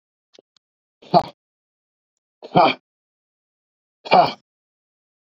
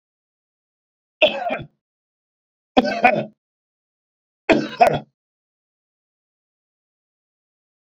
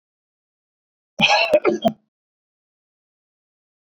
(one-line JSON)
{"exhalation_length": "5.2 s", "exhalation_amplitude": 30015, "exhalation_signal_mean_std_ratio": 0.24, "three_cough_length": "7.9 s", "three_cough_amplitude": 29799, "three_cough_signal_mean_std_ratio": 0.26, "cough_length": "3.9 s", "cough_amplitude": 24544, "cough_signal_mean_std_ratio": 0.3, "survey_phase": "beta (2021-08-13 to 2022-03-07)", "age": "45-64", "gender": "Male", "wearing_mask": "No", "symptom_none": true, "smoker_status": "Ex-smoker", "respiratory_condition_asthma": false, "respiratory_condition_other": false, "recruitment_source": "REACT", "submission_delay": "2 days", "covid_test_result": "Negative", "covid_test_method": "RT-qPCR"}